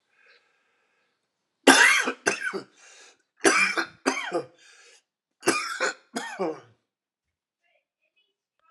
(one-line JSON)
{"three_cough_length": "8.7 s", "three_cough_amplitude": 31030, "three_cough_signal_mean_std_ratio": 0.34, "survey_phase": "alpha (2021-03-01 to 2021-08-12)", "age": "45-64", "gender": "Male", "wearing_mask": "No", "symptom_cough_any": true, "symptom_fatigue": true, "symptom_headache": true, "smoker_status": "Never smoked", "respiratory_condition_asthma": false, "respiratory_condition_other": false, "recruitment_source": "Test and Trace", "submission_delay": "1 day", "covid_test_result": "Positive", "covid_test_method": "RT-qPCR", "covid_ct_value": 29.5, "covid_ct_gene": "ORF1ab gene"}